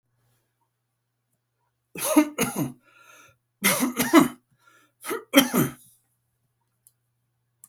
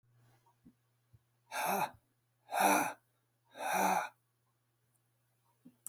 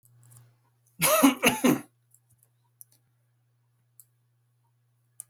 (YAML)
three_cough_length: 7.7 s
three_cough_amplitude: 29880
three_cough_signal_mean_std_ratio: 0.32
exhalation_length: 5.9 s
exhalation_amplitude: 5262
exhalation_signal_mean_std_ratio: 0.37
cough_length: 5.3 s
cough_amplitude: 16125
cough_signal_mean_std_ratio: 0.28
survey_phase: beta (2021-08-13 to 2022-03-07)
age: 65+
gender: Male
wearing_mask: 'No'
symptom_none: true
symptom_onset: 12 days
smoker_status: Ex-smoker
respiratory_condition_asthma: false
respiratory_condition_other: false
recruitment_source: REACT
submission_delay: 1 day
covid_test_result: Negative
covid_test_method: RT-qPCR
influenza_a_test_result: Negative
influenza_b_test_result: Negative